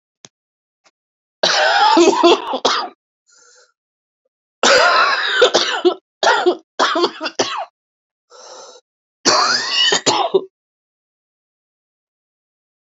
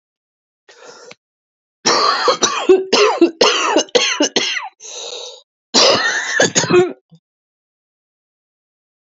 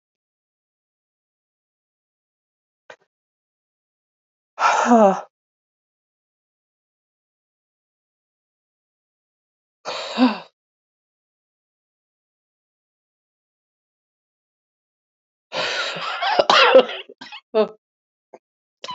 {
  "three_cough_length": "13.0 s",
  "three_cough_amplitude": 32768,
  "three_cough_signal_mean_std_ratio": 0.49,
  "cough_length": "9.1 s",
  "cough_amplitude": 32767,
  "cough_signal_mean_std_ratio": 0.51,
  "exhalation_length": "18.9 s",
  "exhalation_amplitude": 32356,
  "exhalation_signal_mean_std_ratio": 0.24,
  "survey_phase": "alpha (2021-03-01 to 2021-08-12)",
  "age": "45-64",
  "gender": "Female",
  "wearing_mask": "No",
  "symptom_cough_any": true,
  "symptom_shortness_of_breath": true,
  "symptom_fatigue": true,
  "symptom_headache": true,
  "symptom_change_to_sense_of_smell_or_taste": true,
  "symptom_loss_of_taste": true,
  "symptom_onset": "6 days",
  "smoker_status": "Never smoked",
  "respiratory_condition_asthma": false,
  "respiratory_condition_other": false,
  "recruitment_source": "Test and Trace",
  "submission_delay": "2 days",
  "covid_test_result": "Positive",
  "covid_test_method": "RT-qPCR",
  "covid_ct_value": 12.8,
  "covid_ct_gene": "ORF1ab gene",
  "covid_ct_mean": 13.2,
  "covid_viral_load": "47000000 copies/ml",
  "covid_viral_load_category": "High viral load (>1M copies/ml)"
}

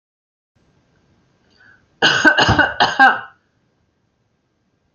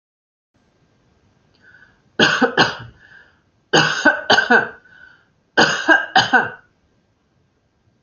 {
  "cough_length": "4.9 s",
  "cough_amplitude": 31104,
  "cough_signal_mean_std_ratio": 0.35,
  "three_cough_length": "8.0 s",
  "three_cough_amplitude": 32768,
  "three_cough_signal_mean_std_ratio": 0.39,
  "survey_phase": "beta (2021-08-13 to 2022-03-07)",
  "age": "45-64",
  "gender": "Female",
  "wearing_mask": "No",
  "symptom_none": true,
  "smoker_status": "Never smoked",
  "respiratory_condition_asthma": false,
  "respiratory_condition_other": false,
  "recruitment_source": "REACT",
  "submission_delay": "2 days",
  "covid_test_result": "Negative",
  "covid_test_method": "RT-qPCR"
}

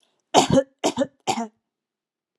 {
  "three_cough_length": "2.4 s",
  "three_cough_amplitude": 29557,
  "three_cough_signal_mean_std_ratio": 0.37,
  "survey_phase": "beta (2021-08-13 to 2022-03-07)",
  "age": "18-44",
  "gender": "Female",
  "wearing_mask": "No",
  "symptom_none": true,
  "smoker_status": "Never smoked",
  "respiratory_condition_asthma": false,
  "respiratory_condition_other": false,
  "recruitment_source": "REACT",
  "submission_delay": "0 days",
  "covid_test_result": "Negative",
  "covid_test_method": "RT-qPCR",
  "influenza_a_test_result": "Negative",
  "influenza_b_test_result": "Negative"
}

